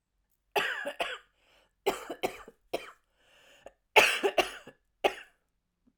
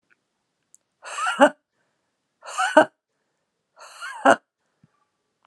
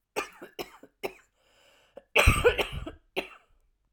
{
  "three_cough_length": "6.0 s",
  "three_cough_amplitude": 16374,
  "three_cough_signal_mean_std_ratio": 0.32,
  "exhalation_length": "5.5 s",
  "exhalation_amplitude": 29073,
  "exhalation_signal_mean_std_ratio": 0.25,
  "cough_length": "3.9 s",
  "cough_amplitude": 15933,
  "cough_signal_mean_std_ratio": 0.32,
  "survey_phase": "alpha (2021-03-01 to 2021-08-12)",
  "age": "45-64",
  "gender": "Female",
  "wearing_mask": "No",
  "symptom_cough_any": true,
  "symptom_shortness_of_breath": true,
  "symptom_fatigue": true,
  "symptom_headache": true,
  "symptom_onset": "12 days",
  "smoker_status": "Never smoked",
  "respiratory_condition_asthma": true,
  "respiratory_condition_other": false,
  "recruitment_source": "REACT",
  "submission_delay": "3 days",
  "covid_test_result": "Negative",
  "covid_test_method": "RT-qPCR",
  "covid_ct_value": 44.0,
  "covid_ct_gene": "N gene"
}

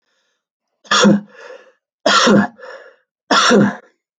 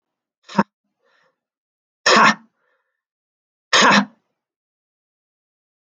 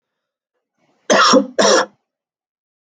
{
  "three_cough_length": "4.2 s",
  "three_cough_amplitude": 30360,
  "three_cough_signal_mean_std_ratio": 0.47,
  "exhalation_length": "5.9 s",
  "exhalation_amplitude": 29668,
  "exhalation_signal_mean_std_ratio": 0.27,
  "cough_length": "2.9 s",
  "cough_amplitude": 30963,
  "cough_signal_mean_std_ratio": 0.39,
  "survey_phase": "alpha (2021-03-01 to 2021-08-12)",
  "age": "18-44",
  "gender": "Male",
  "wearing_mask": "No",
  "symptom_none": true,
  "smoker_status": "Never smoked",
  "respiratory_condition_asthma": false,
  "respiratory_condition_other": false,
  "recruitment_source": "REACT",
  "submission_delay": "1 day",
  "covid_test_result": "Negative",
  "covid_test_method": "RT-qPCR"
}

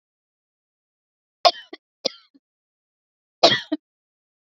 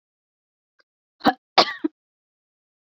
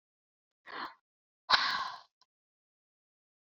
{
  "three_cough_length": "4.5 s",
  "three_cough_amplitude": 29251,
  "three_cough_signal_mean_std_ratio": 0.18,
  "cough_length": "2.9 s",
  "cough_amplitude": 32753,
  "cough_signal_mean_std_ratio": 0.19,
  "exhalation_length": "3.6 s",
  "exhalation_amplitude": 12072,
  "exhalation_signal_mean_std_ratio": 0.27,
  "survey_phase": "beta (2021-08-13 to 2022-03-07)",
  "age": "45-64",
  "gender": "Female",
  "wearing_mask": "No",
  "symptom_none": true,
  "smoker_status": "Never smoked",
  "respiratory_condition_asthma": false,
  "respiratory_condition_other": true,
  "recruitment_source": "REACT",
  "submission_delay": "2 days",
  "covid_test_result": "Negative",
  "covid_test_method": "RT-qPCR"
}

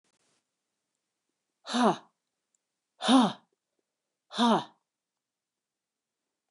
{
  "exhalation_length": "6.5 s",
  "exhalation_amplitude": 10873,
  "exhalation_signal_mean_std_ratio": 0.27,
  "survey_phase": "beta (2021-08-13 to 2022-03-07)",
  "age": "45-64",
  "gender": "Female",
  "wearing_mask": "No",
  "symptom_cough_any": true,
  "symptom_runny_or_blocked_nose": true,
  "symptom_headache": true,
  "smoker_status": "Never smoked",
  "respiratory_condition_asthma": false,
  "respiratory_condition_other": false,
  "recruitment_source": "Test and Trace",
  "submission_delay": "2 days",
  "covid_test_result": "Positive",
  "covid_test_method": "RT-qPCR"
}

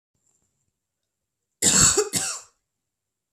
{
  "cough_length": "3.3 s",
  "cough_amplitude": 25155,
  "cough_signal_mean_std_ratio": 0.33,
  "survey_phase": "beta (2021-08-13 to 2022-03-07)",
  "age": "18-44",
  "gender": "Female",
  "wearing_mask": "No",
  "symptom_cough_any": true,
  "symptom_runny_or_blocked_nose": true,
  "symptom_sore_throat": true,
  "symptom_fatigue": true,
  "symptom_fever_high_temperature": true,
  "symptom_headache": true,
  "symptom_onset": "3 days",
  "smoker_status": "Never smoked",
  "respiratory_condition_asthma": false,
  "respiratory_condition_other": false,
  "recruitment_source": "Test and Trace",
  "submission_delay": "1 day",
  "covid_test_result": "Positive",
  "covid_test_method": "ePCR"
}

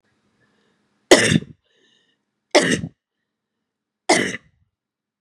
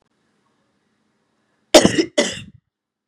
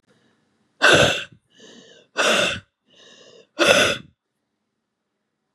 {
  "three_cough_length": "5.2 s",
  "three_cough_amplitude": 32768,
  "three_cough_signal_mean_std_ratio": 0.27,
  "cough_length": "3.1 s",
  "cough_amplitude": 32768,
  "cough_signal_mean_std_ratio": 0.25,
  "exhalation_length": "5.5 s",
  "exhalation_amplitude": 32768,
  "exhalation_signal_mean_std_ratio": 0.37,
  "survey_phase": "beta (2021-08-13 to 2022-03-07)",
  "age": "18-44",
  "gender": "Female",
  "wearing_mask": "No",
  "symptom_cough_any": true,
  "symptom_runny_or_blocked_nose": true,
  "symptom_sore_throat": true,
  "symptom_fatigue": true,
  "symptom_headache": true,
  "symptom_change_to_sense_of_smell_or_taste": true,
  "symptom_loss_of_taste": true,
  "symptom_onset": "8 days",
  "smoker_status": "Never smoked",
  "respiratory_condition_asthma": false,
  "respiratory_condition_other": false,
  "recruitment_source": "Test and Trace",
  "submission_delay": "3 days",
  "covid_test_result": "Negative",
  "covid_test_method": "ePCR"
}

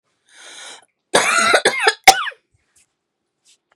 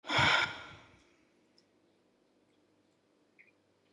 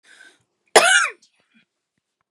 {
  "three_cough_length": "3.8 s",
  "three_cough_amplitude": 32768,
  "three_cough_signal_mean_std_ratio": 0.36,
  "exhalation_length": "3.9 s",
  "exhalation_amplitude": 6205,
  "exhalation_signal_mean_std_ratio": 0.29,
  "cough_length": "2.3 s",
  "cough_amplitude": 32768,
  "cough_signal_mean_std_ratio": 0.29,
  "survey_phase": "beta (2021-08-13 to 2022-03-07)",
  "age": "18-44",
  "gender": "Female",
  "wearing_mask": "No",
  "symptom_cough_any": true,
  "symptom_sore_throat": true,
  "smoker_status": "Never smoked",
  "respiratory_condition_asthma": false,
  "respiratory_condition_other": false,
  "recruitment_source": "Test and Trace",
  "submission_delay": "0 days",
  "covid_test_result": "Negative",
  "covid_test_method": "RT-qPCR"
}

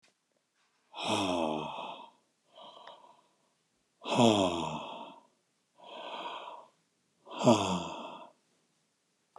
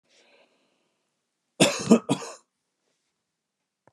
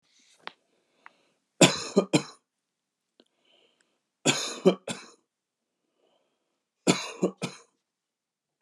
{
  "exhalation_length": "9.4 s",
  "exhalation_amplitude": 10441,
  "exhalation_signal_mean_std_ratio": 0.39,
  "cough_length": "3.9 s",
  "cough_amplitude": 22609,
  "cough_signal_mean_std_ratio": 0.23,
  "three_cough_length": "8.6 s",
  "three_cough_amplitude": 24125,
  "three_cough_signal_mean_std_ratio": 0.24,
  "survey_phase": "beta (2021-08-13 to 2022-03-07)",
  "age": "45-64",
  "gender": "Male",
  "wearing_mask": "No",
  "symptom_none": true,
  "smoker_status": "Never smoked",
  "respiratory_condition_asthma": false,
  "respiratory_condition_other": false,
  "recruitment_source": "REACT",
  "submission_delay": "2 days",
  "covid_test_result": "Negative",
  "covid_test_method": "RT-qPCR",
  "influenza_a_test_result": "Negative",
  "influenza_b_test_result": "Negative"
}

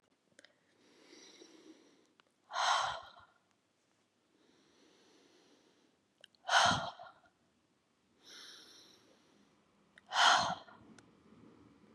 {
  "exhalation_length": "11.9 s",
  "exhalation_amplitude": 6626,
  "exhalation_signal_mean_std_ratio": 0.28,
  "survey_phase": "beta (2021-08-13 to 2022-03-07)",
  "age": "45-64",
  "gender": "Female",
  "wearing_mask": "No",
  "symptom_cough_any": true,
  "symptom_runny_or_blocked_nose": true,
  "symptom_onset": "12 days",
  "smoker_status": "Never smoked",
  "respiratory_condition_asthma": false,
  "respiratory_condition_other": false,
  "recruitment_source": "REACT",
  "submission_delay": "2 days",
  "covid_test_result": "Negative",
  "covid_test_method": "RT-qPCR",
  "influenza_a_test_result": "Negative",
  "influenza_b_test_result": "Negative"
}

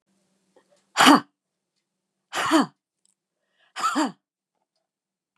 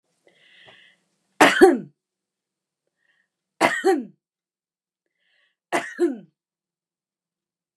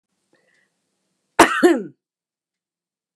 {
  "exhalation_length": "5.4 s",
  "exhalation_amplitude": 27722,
  "exhalation_signal_mean_std_ratio": 0.27,
  "three_cough_length": "7.8 s",
  "three_cough_amplitude": 29204,
  "three_cough_signal_mean_std_ratio": 0.26,
  "cough_length": "3.2 s",
  "cough_amplitude": 29204,
  "cough_signal_mean_std_ratio": 0.25,
  "survey_phase": "beta (2021-08-13 to 2022-03-07)",
  "age": "65+",
  "gender": "Female",
  "wearing_mask": "No",
  "symptom_cough_any": true,
  "smoker_status": "Never smoked",
  "respiratory_condition_asthma": false,
  "respiratory_condition_other": false,
  "recruitment_source": "REACT",
  "submission_delay": "1 day",
  "covid_test_result": "Negative",
  "covid_test_method": "RT-qPCR",
  "influenza_a_test_result": "Negative",
  "influenza_b_test_result": "Negative"
}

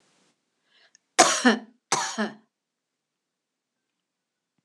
{
  "cough_length": "4.6 s",
  "cough_amplitude": 25988,
  "cough_signal_mean_std_ratio": 0.26,
  "survey_phase": "beta (2021-08-13 to 2022-03-07)",
  "age": "65+",
  "gender": "Female",
  "wearing_mask": "No",
  "symptom_none": true,
  "smoker_status": "Ex-smoker",
  "respiratory_condition_asthma": false,
  "respiratory_condition_other": false,
  "recruitment_source": "REACT",
  "submission_delay": "2 days",
  "covid_test_result": "Negative",
  "covid_test_method": "RT-qPCR",
  "influenza_a_test_result": "Negative",
  "influenza_b_test_result": "Negative"
}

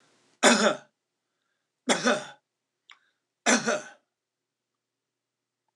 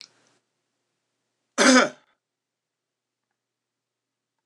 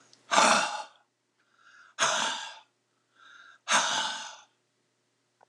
{
  "three_cough_length": "5.8 s",
  "three_cough_amplitude": 19294,
  "three_cough_signal_mean_std_ratio": 0.3,
  "cough_length": "4.5 s",
  "cough_amplitude": 24257,
  "cough_signal_mean_std_ratio": 0.2,
  "exhalation_length": "5.5 s",
  "exhalation_amplitude": 17730,
  "exhalation_signal_mean_std_ratio": 0.41,
  "survey_phase": "alpha (2021-03-01 to 2021-08-12)",
  "age": "65+",
  "gender": "Male",
  "wearing_mask": "No",
  "symptom_none": true,
  "smoker_status": "Prefer not to say",
  "respiratory_condition_asthma": false,
  "respiratory_condition_other": false,
  "recruitment_source": "REACT",
  "submission_delay": "6 days",
  "covid_test_result": "Negative",
  "covid_test_method": "RT-qPCR"
}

